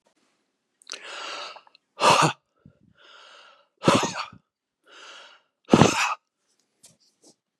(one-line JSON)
{"exhalation_length": "7.6 s", "exhalation_amplitude": 31436, "exhalation_signal_mean_std_ratio": 0.3, "survey_phase": "beta (2021-08-13 to 2022-03-07)", "age": "65+", "gender": "Male", "wearing_mask": "No", "symptom_none": true, "smoker_status": "Never smoked", "respiratory_condition_asthma": false, "respiratory_condition_other": false, "recruitment_source": "REACT", "submission_delay": "1 day", "covid_test_result": "Negative", "covid_test_method": "RT-qPCR", "influenza_a_test_result": "Negative", "influenza_b_test_result": "Negative"}